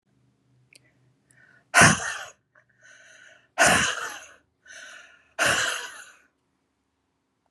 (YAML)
exhalation_length: 7.5 s
exhalation_amplitude: 25939
exhalation_signal_mean_std_ratio: 0.31
survey_phase: beta (2021-08-13 to 2022-03-07)
age: 45-64
gender: Female
wearing_mask: 'No'
symptom_cough_any: true
smoker_status: Never smoked
respiratory_condition_asthma: false
respiratory_condition_other: false
recruitment_source: REACT
submission_delay: 1 day
covid_test_result: Negative
covid_test_method: RT-qPCR